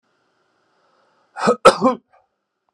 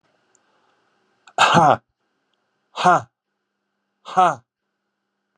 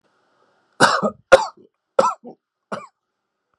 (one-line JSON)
{"cough_length": "2.7 s", "cough_amplitude": 32768, "cough_signal_mean_std_ratio": 0.26, "exhalation_length": "5.4 s", "exhalation_amplitude": 28745, "exhalation_signal_mean_std_ratio": 0.29, "three_cough_length": "3.6 s", "three_cough_amplitude": 32768, "three_cough_signal_mean_std_ratio": 0.28, "survey_phase": "beta (2021-08-13 to 2022-03-07)", "age": "45-64", "gender": "Male", "wearing_mask": "No", "symptom_none": true, "smoker_status": "Never smoked", "respiratory_condition_asthma": false, "respiratory_condition_other": false, "recruitment_source": "REACT", "submission_delay": "1 day", "covid_test_result": "Negative", "covid_test_method": "RT-qPCR"}